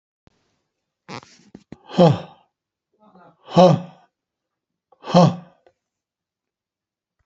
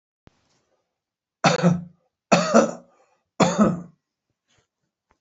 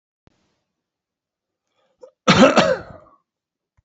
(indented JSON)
{
  "exhalation_length": "7.3 s",
  "exhalation_amplitude": 28198,
  "exhalation_signal_mean_std_ratio": 0.25,
  "three_cough_length": "5.2 s",
  "three_cough_amplitude": 26530,
  "three_cough_signal_mean_std_ratio": 0.35,
  "cough_length": "3.8 s",
  "cough_amplitude": 28565,
  "cough_signal_mean_std_ratio": 0.28,
  "survey_phase": "beta (2021-08-13 to 2022-03-07)",
  "age": "65+",
  "gender": "Male",
  "wearing_mask": "No",
  "symptom_shortness_of_breath": true,
  "smoker_status": "Ex-smoker",
  "respiratory_condition_asthma": false,
  "respiratory_condition_other": true,
  "recruitment_source": "REACT",
  "submission_delay": "2 days",
  "covid_test_result": "Negative",
  "covid_test_method": "RT-qPCR",
  "influenza_a_test_result": "Negative",
  "influenza_b_test_result": "Negative"
}